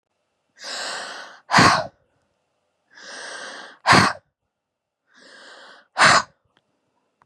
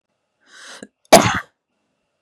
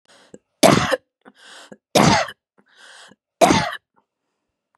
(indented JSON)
{
  "exhalation_length": "7.3 s",
  "exhalation_amplitude": 29451,
  "exhalation_signal_mean_std_ratio": 0.32,
  "cough_length": "2.2 s",
  "cough_amplitude": 32768,
  "cough_signal_mean_std_ratio": 0.23,
  "three_cough_length": "4.8 s",
  "three_cough_amplitude": 32768,
  "three_cough_signal_mean_std_ratio": 0.34,
  "survey_phase": "beta (2021-08-13 to 2022-03-07)",
  "age": "18-44",
  "gender": "Female",
  "wearing_mask": "No",
  "symptom_fatigue": true,
  "symptom_headache": true,
  "smoker_status": "Never smoked",
  "respiratory_condition_asthma": false,
  "respiratory_condition_other": false,
  "recruitment_source": "REACT",
  "submission_delay": "2 days",
  "covid_test_result": "Negative",
  "covid_test_method": "RT-qPCR",
  "influenza_a_test_result": "Negative",
  "influenza_b_test_result": "Negative"
}